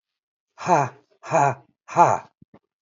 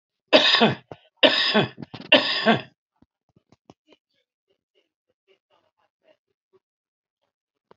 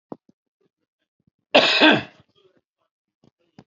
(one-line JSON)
{"exhalation_length": "2.8 s", "exhalation_amplitude": 25960, "exhalation_signal_mean_std_ratio": 0.38, "three_cough_length": "7.8 s", "three_cough_amplitude": 31831, "three_cough_signal_mean_std_ratio": 0.3, "cough_length": "3.7 s", "cough_amplitude": 32768, "cough_signal_mean_std_ratio": 0.27, "survey_phase": "beta (2021-08-13 to 2022-03-07)", "age": "65+", "gender": "Male", "wearing_mask": "No", "symptom_cough_any": true, "symptom_shortness_of_breath": true, "smoker_status": "Current smoker (11 or more cigarettes per day)", "respiratory_condition_asthma": false, "respiratory_condition_other": true, "recruitment_source": "REACT", "submission_delay": "2 days", "covid_test_result": "Negative", "covid_test_method": "RT-qPCR", "influenza_a_test_result": "Negative", "influenza_b_test_result": "Negative"}